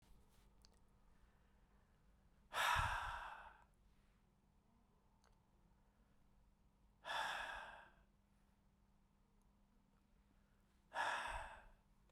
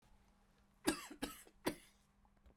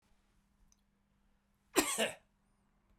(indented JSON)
{
  "exhalation_length": "12.1 s",
  "exhalation_amplitude": 1394,
  "exhalation_signal_mean_std_ratio": 0.37,
  "three_cough_length": "2.6 s",
  "three_cough_amplitude": 2955,
  "three_cough_signal_mean_std_ratio": 0.31,
  "cough_length": "3.0 s",
  "cough_amplitude": 7621,
  "cough_signal_mean_std_ratio": 0.26,
  "survey_phase": "beta (2021-08-13 to 2022-03-07)",
  "age": "65+",
  "gender": "Male",
  "wearing_mask": "No",
  "symptom_cough_any": true,
  "symptom_runny_or_blocked_nose": true,
  "symptom_headache": true,
  "symptom_change_to_sense_of_smell_or_taste": true,
  "symptom_loss_of_taste": true,
  "symptom_onset": "3 days",
  "smoker_status": "Ex-smoker",
  "respiratory_condition_asthma": false,
  "respiratory_condition_other": false,
  "recruitment_source": "Test and Trace",
  "submission_delay": "2 days",
  "covid_test_result": "Positive",
  "covid_test_method": "RT-qPCR",
  "covid_ct_value": 19.4,
  "covid_ct_gene": "ORF1ab gene"
}